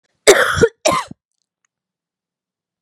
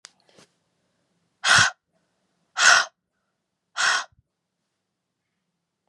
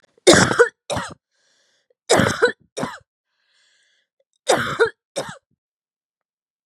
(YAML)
cough_length: 2.8 s
cough_amplitude: 32768
cough_signal_mean_std_ratio: 0.33
exhalation_length: 5.9 s
exhalation_amplitude: 27189
exhalation_signal_mean_std_ratio: 0.28
three_cough_length: 6.7 s
three_cough_amplitude: 32767
three_cough_signal_mean_std_ratio: 0.33
survey_phase: beta (2021-08-13 to 2022-03-07)
age: 18-44
gender: Female
wearing_mask: 'No'
symptom_cough_any: true
symptom_runny_or_blocked_nose: true
symptom_fatigue: true
symptom_headache: true
symptom_change_to_sense_of_smell_or_taste: true
symptom_loss_of_taste: true
symptom_onset: 4 days
smoker_status: Never smoked
respiratory_condition_asthma: false
respiratory_condition_other: false
recruitment_source: Test and Trace
submission_delay: 2 days
covid_test_result: Positive
covid_test_method: ePCR